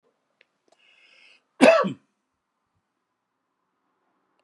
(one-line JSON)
{"cough_length": "4.4 s", "cough_amplitude": 28896, "cough_signal_mean_std_ratio": 0.19, "survey_phase": "beta (2021-08-13 to 2022-03-07)", "age": "65+", "gender": "Male", "wearing_mask": "No", "symptom_none": true, "smoker_status": "Ex-smoker", "respiratory_condition_asthma": false, "respiratory_condition_other": false, "recruitment_source": "REACT", "submission_delay": "6 days", "covid_test_result": "Negative", "covid_test_method": "RT-qPCR"}